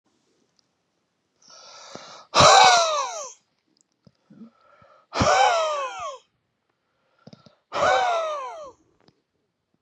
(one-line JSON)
{"exhalation_length": "9.8 s", "exhalation_amplitude": 27399, "exhalation_signal_mean_std_ratio": 0.38, "survey_phase": "beta (2021-08-13 to 2022-03-07)", "age": "65+", "gender": "Male", "wearing_mask": "No", "symptom_none": true, "smoker_status": "Ex-smoker", "respiratory_condition_asthma": false, "respiratory_condition_other": false, "recruitment_source": "REACT", "submission_delay": "1 day", "covid_test_result": "Negative", "covid_test_method": "RT-qPCR"}